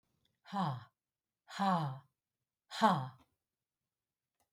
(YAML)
exhalation_length: 4.5 s
exhalation_amplitude: 5311
exhalation_signal_mean_std_ratio: 0.36
survey_phase: beta (2021-08-13 to 2022-03-07)
age: 65+
gender: Female
wearing_mask: 'No'
symptom_none: true
smoker_status: Never smoked
respiratory_condition_asthma: false
respiratory_condition_other: false
recruitment_source: REACT
submission_delay: 2 days
covid_test_result: Negative
covid_test_method: RT-qPCR
influenza_a_test_result: Unknown/Void
influenza_b_test_result: Unknown/Void